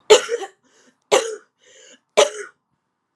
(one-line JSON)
{"three_cough_length": "3.2 s", "three_cough_amplitude": 32767, "three_cough_signal_mean_std_ratio": 0.3, "survey_phase": "alpha (2021-03-01 to 2021-08-12)", "age": "18-44", "gender": "Female", "wearing_mask": "No", "symptom_cough_any": true, "symptom_fatigue": true, "symptom_headache": true, "symptom_change_to_sense_of_smell_or_taste": true, "symptom_loss_of_taste": true, "symptom_onset": "3 days", "smoker_status": "Current smoker (11 or more cigarettes per day)", "respiratory_condition_asthma": false, "respiratory_condition_other": false, "recruitment_source": "Test and Trace", "submission_delay": "1 day", "covid_test_result": "Positive", "covid_test_method": "RT-qPCR", "covid_ct_value": 13.6, "covid_ct_gene": "ORF1ab gene", "covid_ct_mean": 14.0, "covid_viral_load": "26000000 copies/ml", "covid_viral_load_category": "High viral load (>1M copies/ml)"}